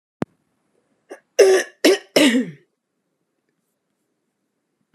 {"cough_length": "4.9 s", "cough_amplitude": 31752, "cough_signal_mean_std_ratio": 0.31, "survey_phase": "beta (2021-08-13 to 2022-03-07)", "age": "18-44", "gender": "Female", "wearing_mask": "No", "symptom_cough_any": true, "symptom_runny_or_blocked_nose": true, "symptom_shortness_of_breath": true, "symptom_sore_throat": true, "symptom_change_to_sense_of_smell_or_taste": true, "symptom_other": true, "symptom_onset": "2 days", "smoker_status": "Ex-smoker", "respiratory_condition_asthma": false, "respiratory_condition_other": false, "recruitment_source": "Test and Trace", "submission_delay": "2 days", "covid_test_result": "Positive", "covid_test_method": "ePCR"}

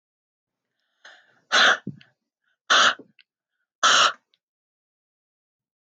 {"exhalation_length": "5.9 s", "exhalation_amplitude": 19174, "exhalation_signal_mean_std_ratio": 0.3, "survey_phase": "beta (2021-08-13 to 2022-03-07)", "age": "18-44", "gender": "Female", "wearing_mask": "No", "symptom_runny_or_blocked_nose": true, "symptom_sore_throat": true, "symptom_onset": "6 days", "smoker_status": "Ex-smoker", "respiratory_condition_asthma": false, "respiratory_condition_other": false, "recruitment_source": "REACT", "submission_delay": "1 day", "covid_test_result": "Positive", "covid_test_method": "RT-qPCR", "covid_ct_value": 22.8, "covid_ct_gene": "E gene", "influenza_a_test_result": "Negative", "influenza_b_test_result": "Negative"}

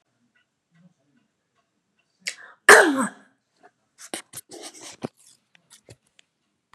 {"cough_length": "6.7 s", "cough_amplitude": 32768, "cough_signal_mean_std_ratio": 0.19, "survey_phase": "beta (2021-08-13 to 2022-03-07)", "age": "45-64", "gender": "Female", "wearing_mask": "No", "symptom_fatigue": true, "symptom_onset": "12 days", "smoker_status": "Never smoked", "respiratory_condition_asthma": false, "respiratory_condition_other": false, "recruitment_source": "REACT", "submission_delay": "2 days", "covid_test_result": "Negative", "covid_test_method": "RT-qPCR", "influenza_a_test_result": "Negative", "influenza_b_test_result": "Negative"}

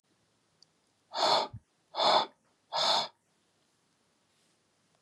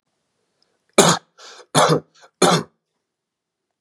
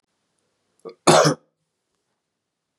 {"exhalation_length": "5.0 s", "exhalation_amplitude": 7746, "exhalation_signal_mean_std_ratio": 0.36, "three_cough_length": "3.8 s", "three_cough_amplitude": 32768, "three_cough_signal_mean_std_ratio": 0.32, "cough_length": "2.8 s", "cough_amplitude": 31278, "cough_signal_mean_std_ratio": 0.25, "survey_phase": "beta (2021-08-13 to 2022-03-07)", "age": "45-64", "gender": "Male", "wearing_mask": "No", "symptom_none": true, "smoker_status": "Ex-smoker", "respiratory_condition_asthma": false, "respiratory_condition_other": false, "recruitment_source": "REACT", "submission_delay": "3 days", "covid_test_result": "Negative", "covid_test_method": "RT-qPCR", "influenza_a_test_result": "Negative", "influenza_b_test_result": "Negative"}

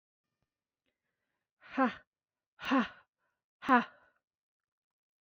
{"exhalation_length": "5.2 s", "exhalation_amplitude": 7463, "exhalation_signal_mean_std_ratio": 0.25, "survey_phase": "beta (2021-08-13 to 2022-03-07)", "age": "18-44", "gender": "Female", "wearing_mask": "No", "symptom_runny_or_blocked_nose": true, "symptom_sore_throat": true, "smoker_status": "Never smoked", "respiratory_condition_asthma": false, "respiratory_condition_other": false, "recruitment_source": "Test and Trace", "submission_delay": "2 days", "covid_test_result": "Negative", "covid_test_method": "RT-qPCR"}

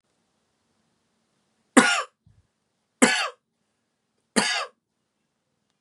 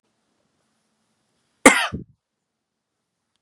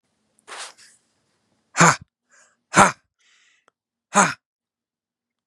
{"three_cough_length": "5.8 s", "three_cough_amplitude": 30554, "three_cough_signal_mean_std_ratio": 0.25, "cough_length": "3.4 s", "cough_amplitude": 32768, "cough_signal_mean_std_ratio": 0.17, "exhalation_length": "5.5 s", "exhalation_amplitude": 32767, "exhalation_signal_mean_std_ratio": 0.23, "survey_phase": "beta (2021-08-13 to 2022-03-07)", "age": "18-44", "gender": "Male", "wearing_mask": "No", "symptom_cough_any": true, "symptom_runny_or_blocked_nose": true, "symptom_sore_throat": true, "symptom_fatigue": true, "symptom_change_to_sense_of_smell_or_taste": true, "symptom_loss_of_taste": true, "symptom_other": true, "symptom_onset": "1 day", "smoker_status": "Never smoked", "respiratory_condition_asthma": false, "respiratory_condition_other": false, "recruitment_source": "Test and Trace", "submission_delay": "0 days", "covid_test_result": "Positive", "covid_test_method": "ePCR"}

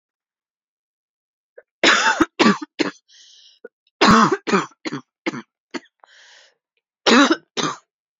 {"cough_length": "8.2 s", "cough_amplitude": 32767, "cough_signal_mean_std_ratio": 0.36, "survey_phase": "beta (2021-08-13 to 2022-03-07)", "age": "18-44", "gender": "Female", "wearing_mask": "No", "symptom_cough_any": true, "symptom_runny_or_blocked_nose": true, "symptom_shortness_of_breath": true, "symptom_sore_throat": true, "symptom_abdominal_pain": true, "symptom_diarrhoea": true, "symptom_fatigue": true, "symptom_headache": true, "symptom_change_to_sense_of_smell_or_taste": true, "smoker_status": "Never smoked", "respiratory_condition_asthma": true, "respiratory_condition_other": false, "recruitment_source": "Test and Trace", "submission_delay": "1 day", "covid_test_result": "Positive", "covid_test_method": "RT-qPCR", "covid_ct_value": 29.5, "covid_ct_gene": "ORF1ab gene", "covid_ct_mean": 29.8, "covid_viral_load": "160 copies/ml", "covid_viral_load_category": "Minimal viral load (< 10K copies/ml)"}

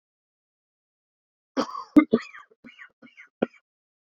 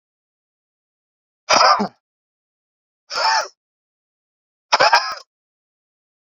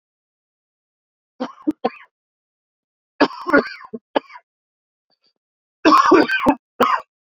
{"cough_length": "4.0 s", "cough_amplitude": 23623, "cough_signal_mean_std_ratio": 0.19, "exhalation_length": "6.3 s", "exhalation_amplitude": 29972, "exhalation_signal_mean_std_ratio": 0.31, "three_cough_length": "7.3 s", "three_cough_amplitude": 27917, "three_cough_signal_mean_std_ratio": 0.32, "survey_phase": "beta (2021-08-13 to 2022-03-07)", "age": "18-44", "gender": "Male", "wearing_mask": "No", "symptom_cough_any": true, "symptom_runny_or_blocked_nose": true, "symptom_shortness_of_breath": true, "symptom_fatigue": true, "symptom_change_to_sense_of_smell_or_taste": true, "symptom_loss_of_taste": true, "symptom_onset": "4 days", "smoker_status": "Current smoker (11 or more cigarettes per day)", "respiratory_condition_asthma": false, "respiratory_condition_other": false, "recruitment_source": "Test and Trace", "submission_delay": "2 days", "covid_test_result": "Positive", "covid_test_method": "RT-qPCR", "covid_ct_value": 15.5, "covid_ct_gene": "ORF1ab gene", "covid_ct_mean": 16.0, "covid_viral_load": "5700000 copies/ml", "covid_viral_load_category": "High viral load (>1M copies/ml)"}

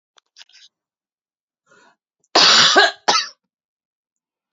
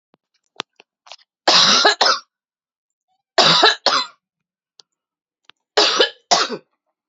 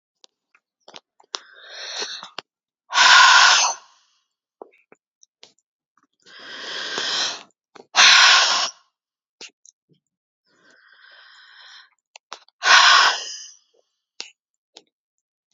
{"cough_length": "4.5 s", "cough_amplitude": 32768, "cough_signal_mean_std_ratio": 0.32, "three_cough_length": "7.1 s", "three_cough_amplitude": 32768, "three_cough_signal_mean_std_ratio": 0.39, "exhalation_length": "15.5 s", "exhalation_amplitude": 32105, "exhalation_signal_mean_std_ratio": 0.33, "survey_phase": "alpha (2021-03-01 to 2021-08-12)", "age": "45-64", "gender": "Female", "wearing_mask": "No", "symptom_none": true, "smoker_status": "Ex-smoker", "respiratory_condition_asthma": false, "respiratory_condition_other": false, "recruitment_source": "REACT", "submission_delay": "2 days", "covid_test_result": "Negative", "covid_test_method": "RT-qPCR"}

